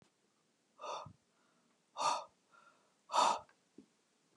{
  "exhalation_length": "4.4 s",
  "exhalation_amplitude": 4355,
  "exhalation_signal_mean_std_ratio": 0.31,
  "survey_phase": "beta (2021-08-13 to 2022-03-07)",
  "age": "45-64",
  "gender": "Female",
  "wearing_mask": "No",
  "symptom_runny_or_blocked_nose": true,
  "smoker_status": "Never smoked",
  "respiratory_condition_asthma": false,
  "respiratory_condition_other": false,
  "recruitment_source": "REACT",
  "submission_delay": "1 day",
  "covid_test_result": "Negative",
  "covid_test_method": "RT-qPCR",
  "influenza_a_test_result": "Negative",
  "influenza_b_test_result": "Negative"
}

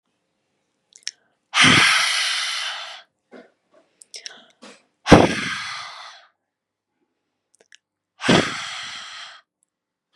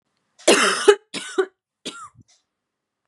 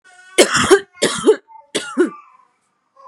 {
  "exhalation_length": "10.2 s",
  "exhalation_amplitude": 32768,
  "exhalation_signal_mean_std_ratio": 0.34,
  "cough_length": "3.1 s",
  "cough_amplitude": 32700,
  "cough_signal_mean_std_ratio": 0.33,
  "three_cough_length": "3.1 s",
  "three_cough_amplitude": 32768,
  "three_cough_signal_mean_std_ratio": 0.42,
  "survey_phase": "beta (2021-08-13 to 2022-03-07)",
  "age": "18-44",
  "gender": "Female",
  "wearing_mask": "No",
  "symptom_cough_any": true,
  "symptom_new_continuous_cough": true,
  "symptom_runny_or_blocked_nose": true,
  "symptom_sore_throat": true,
  "symptom_fatigue": true,
  "symptom_fever_high_temperature": true,
  "symptom_headache": true,
  "symptom_other": true,
  "symptom_onset": "7 days",
  "smoker_status": "Never smoked",
  "respiratory_condition_asthma": false,
  "respiratory_condition_other": false,
  "recruitment_source": "Test and Trace",
  "submission_delay": "4 days",
  "covid_test_result": "Positive",
  "covid_test_method": "RT-qPCR",
  "covid_ct_value": 19.3,
  "covid_ct_gene": "ORF1ab gene",
  "covid_ct_mean": 20.2,
  "covid_viral_load": "230000 copies/ml",
  "covid_viral_load_category": "Low viral load (10K-1M copies/ml)"
}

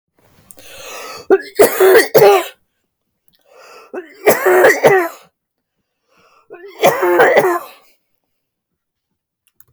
{
  "three_cough_length": "9.7 s",
  "three_cough_amplitude": 32768,
  "three_cough_signal_mean_std_ratio": 0.43,
  "survey_phase": "beta (2021-08-13 to 2022-03-07)",
  "age": "45-64",
  "gender": "Female",
  "wearing_mask": "No",
  "symptom_runny_or_blocked_nose": true,
  "smoker_status": "Never smoked",
  "respiratory_condition_asthma": true,
  "respiratory_condition_other": false,
  "recruitment_source": "REACT",
  "submission_delay": "3 days",
  "covid_test_result": "Negative",
  "covid_test_method": "RT-qPCR",
  "influenza_a_test_result": "Negative",
  "influenza_b_test_result": "Negative"
}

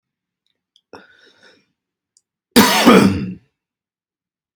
{
  "cough_length": "4.6 s",
  "cough_amplitude": 32768,
  "cough_signal_mean_std_ratio": 0.3,
  "survey_phase": "beta (2021-08-13 to 2022-03-07)",
  "age": "18-44",
  "gender": "Male",
  "wearing_mask": "No",
  "symptom_none": true,
  "smoker_status": "Ex-smoker",
  "respiratory_condition_asthma": false,
  "respiratory_condition_other": false,
  "recruitment_source": "REACT",
  "submission_delay": "0 days",
  "covid_test_result": "Negative",
  "covid_test_method": "RT-qPCR",
  "influenza_a_test_result": "Negative",
  "influenza_b_test_result": "Negative"
}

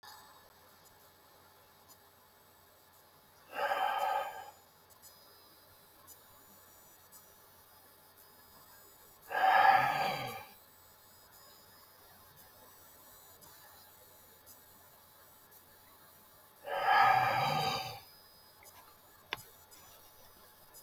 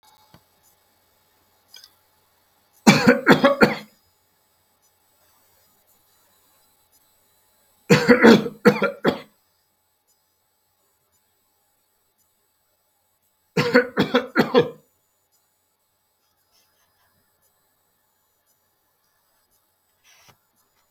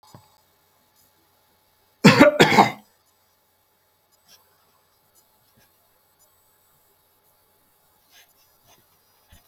{
  "exhalation_length": "20.8 s",
  "exhalation_amplitude": 7113,
  "exhalation_signal_mean_std_ratio": 0.35,
  "three_cough_length": "20.9 s",
  "three_cough_amplitude": 32768,
  "three_cough_signal_mean_std_ratio": 0.24,
  "cough_length": "9.5 s",
  "cough_amplitude": 32768,
  "cough_signal_mean_std_ratio": 0.19,
  "survey_phase": "beta (2021-08-13 to 2022-03-07)",
  "age": "65+",
  "gender": "Male",
  "wearing_mask": "No",
  "symptom_none": true,
  "symptom_onset": "11 days",
  "smoker_status": "Never smoked",
  "respiratory_condition_asthma": false,
  "respiratory_condition_other": false,
  "recruitment_source": "REACT",
  "submission_delay": "6 days",
  "covid_test_result": "Negative",
  "covid_test_method": "RT-qPCR",
  "influenza_a_test_result": "Negative",
  "influenza_b_test_result": "Negative"
}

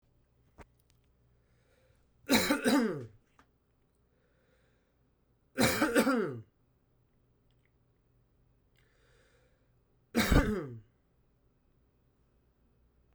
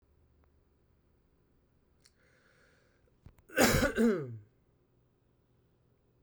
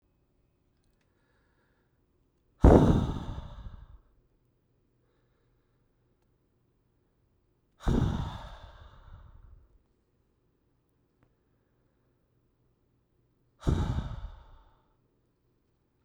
{
  "three_cough_length": "13.1 s",
  "three_cough_amplitude": 9916,
  "three_cough_signal_mean_std_ratio": 0.31,
  "cough_length": "6.2 s",
  "cough_amplitude": 8603,
  "cough_signal_mean_std_ratio": 0.27,
  "exhalation_length": "16.0 s",
  "exhalation_amplitude": 18448,
  "exhalation_signal_mean_std_ratio": 0.22,
  "survey_phase": "beta (2021-08-13 to 2022-03-07)",
  "age": "18-44",
  "gender": "Male",
  "wearing_mask": "No",
  "symptom_runny_or_blocked_nose": true,
  "symptom_diarrhoea": true,
  "symptom_fatigue": true,
  "smoker_status": "Ex-smoker",
  "respiratory_condition_asthma": false,
  "respiratory_condition_other": false,
  "recruitment_source": "Test and Trace",
  "submission_delay": "2 days",
  "covid_test_result": "Positive",
  "covid_test_method": "RT-qPCR",
  "covid_ct_value": 13.8,
  "covid_ct_gene": "ORF1ab gene",
  "covid_ct_mean": 14.3,
  "covid_viral_load": "21000000 copies/ml",
  "covid_viral_load_category": "High viral load (>1M copies/ml)"
}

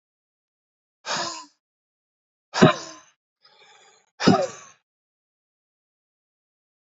{
  "exhalation_length": "6.9 s",
  "exhalation_amplitude": 28777,
  "exhalation_signal_mean_std_ratio": 0.22,
  "survey_phase": "beta (2021-08-13 to 2022-03-07)",
  "age": "45-64",
  "gender": "Male",
  "wearing_mask": "No",
  "symptom_cough_any": true,
  "symptom_runny_or_blocked_nose": true,
  "symptom_sore_throat": true,
  "symptom_change_to_sense_of_smell_or_taste": true,
  "symptom_onset": "5 days",
  "smoker_status": "Never smoked",
  "respiratory_condition_asthma": false,
  "respiratory_condition_other": false,
  "recruitment_source": "Test and Trace",
  "submission_delay": "2 days",
  "covid_test_result": "Positive",
  "covid_test_method": "RT-qPCR",
  "covid_ct_value": 20.6,
  "covid_ct_gene": "N gene",
  "covid_ct_mean": 21.6,
  "covid_viral_load": "85000 copies/ml",
  "covid_viral_load_category": "Low viral load (10K-1M copies/ml)"
}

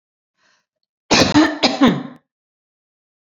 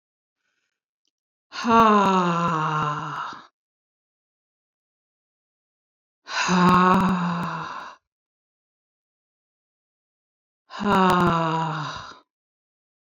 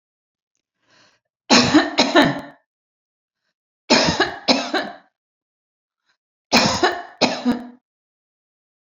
{
  "cough_length": "3.3 s",
  "cough_amplitude": 30021,
  "cough_signal_mean_std_ratio": 0.38,
  "exhalation_length": "13.1 s",
  "exhalation_amplitude": 22071,
  "exhalation_signal_mean_std_ratio": 0.44,
  "three_cough_length": "9.0 s",
  "three_cough_amplitude": 32767,
  "three_cough_signal_mean_std_ratio": 0.39,
  "survey_phase": "alpha (2021-03-01 to 2021-08-12)",
  "age": "45-64",
  "gender": "Female",
  "wearing_mask": "No",
  "symptom_none": true,
  "smoker_status": "Never smoked",
  "respiratory_condition_asthma": false,
  "respiratory_condition_other": false,
  "recruitment_source": "REACT",
  "submission_delay": "1 day",
  "covid_test_result": "Negative",
  "covid_test_method": "RT-qPCR"
}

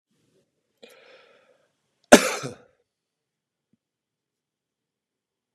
{
  "cough_length": "5.5 s",
  "cough_amplitude": 32768,
  "cough_signal_mean_std_ratio": 0.12,
  "survey_phase": "beta (2021-08-13 to 2022-03-07)",
  "age": "65+",
  "gender": "Male",
  "wearing_mask": "No",
  "symptom_none": true,
  "smoker_status": "Ex-smoker",
  "respiratory_condition_asthma": false,
  "respiratory_condition_other": false,
  "recruitment_source": "REACT",
  "submission_delay": "1 day",
  "covid_test_result": "Negative",
  "covid_test_method": "RT-qPCR",
  "influenza_a_test_result": "Unknown/Void",
  "influenza_b_test_result": "Unknown/Void"
}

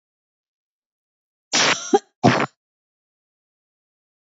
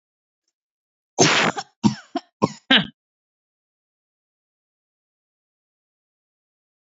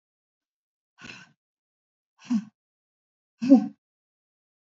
{
  "cough_length": "4.4 s",
  "cough_amplitude": 27252,
  "cough_signal_mean_std_ratio": 0.27,
  "three_cough_length": "6.9 s",
  "three_cough_amplitude": 32767,
  "three_cough_signal_mean_std_ratio": 0.24,
  "exhalation_length": "4.6 s",
  "exhalation_amplitude": 20622,
  "exhalation_signal_mean_std_ratio": 0.2,
  "survey_phase": "beta (2021-08-13 to 2022-03-07)",
  "age": "45-64",
  "gender": "Female",
  "wearing_mask": "Yes",
  "symptom_none": true,
  "smoker_status": "Never smoked",
  "respiratory_condition_asthma": false,
  "respiratory_condition_other": false,
  "recruitment_source": "REACT",
  "submission_delay": "4 days",
  "covid_test_result": "Negative",
  "covid_test_method": "RT-qPCR",
  "influenza_a_test_result": "Negative",
  "influenza_b_test_result": "Negative"
}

